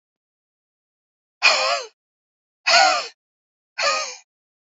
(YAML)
exhalation_length: 4.7 s
exhalation_amplitude: 27324
exhalation_signal_mean_std_ratio: 0.37
survey_phase: beta (2021-08-13 to 2022-03-07)
age: 45-64
gender: Female
wearing_mask: 'No'
symptom_cough_any: true
smoker_status: Current smoker (e-cigarettes or vapes only)
respiratory_condition_asthma: false
respiratory_condition_other: false
recruitment_source: REACT
submission_delay: 2 days
covid_test_result: Negative
covid_test_method: RT-qPCR
influenza_a_test_result: Negative
influenza_b_test_result: Negative